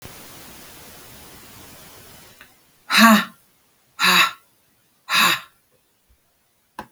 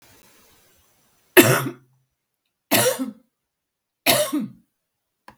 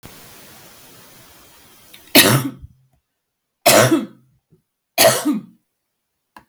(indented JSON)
{
  "exhalation_length": "6.9 s",
  "exhalation_amplitude": 32766,
  "exhalation_signal_mean_std_ratio": 0.32,
  "three_cough_length": "5.4 s",
  "three_cough_amplitude": 32768,
  "three_cough_signal_mean_std_ratio": 0.31,
  "cough_length": "6.5 s",
  "cough_amplitude": 32768,
  "cough_signal_mean_std_ratio": 0.34,
  "survey_phase": "alpha (2021-03-01 to 2021-08-12)",
  "age": "45-64",
  "gender": "Female",
  "wearing_mask": "No",
  "symptom_none": true,
  "smoker_status": "Ex-smoker",
  "respiratory_condition_asthma": false,
  "respiratory_condition_other": false,
  "recruitment_source": "REACT",
  "submission_delay": "1 day",
  "covid_test_result": "Negative",
  "covid_test_method": "RT-qPCR"
}